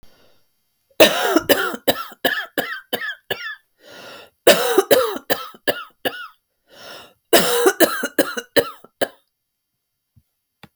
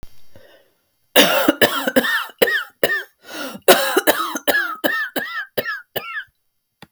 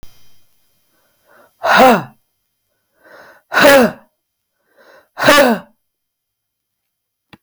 three_cough_length: 10.8 s
three_cough_amplitude: 32768
three_cough_signal_mean_std_ratio: 0.4
cough_length: 6.9 s
cough_amplitude: 32768
cough_signal_mean_std_ratio: 0.51
exhalation_length: 7.4 s
exhalation_amplitude: 32768
exhalation_signal_mean_std_ratio: 0.34
survey_phase: beta (2021-08-13 to 2022-03-07)
age: 45-64
gender: Female
wearing_mask: 'No'
symptom_cough_any: true
symptom_sore_throat: true
symptom_fatigue: true
symptom_headache: true
symptom_change_to_sense_of_smell_or_taste: true
symptom_other: true
symptom_onset: 3 days
smoker_status: Ex-smoker
respiratory_condition_asthma: false
respiratory_condition_other: false
recruitment_source: Test and Trace
submission_delay: 2 days
covid_test_result: Positive
covid_test_method: RT-qPCR
covid_ct_value: 22.4
covid_ct_gene: N gene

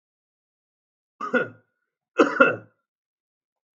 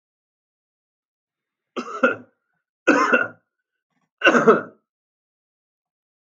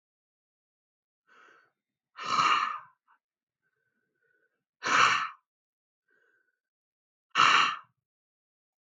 cough_length: 3.8 s
cough_amplitude: 27145
cough_signal_mean_std_ratio: 0.26
three_cough_length: 6.4 s
three_cough_amplitude: 30688
three_cough_signal_mean_std_ratio: 0.29
exhalation_length: 8.9 s
exhalation_amplitude: 14996
exhalation_signal_mean_std_ratio: 0.3
survey_phase: alpha (2021-03-01 to 2021-08-12)
age: 45-64
gender: Male
wearing_mask: 'No'
symptom_none: true
smoker_status: Never smoked
respiratory_condition_asthma: false
respiratory_condition_other: false
recruitment_source: REACT
submission_delay: 1 day
covid_test_result: Negative
covid_test_method: RT-qPCR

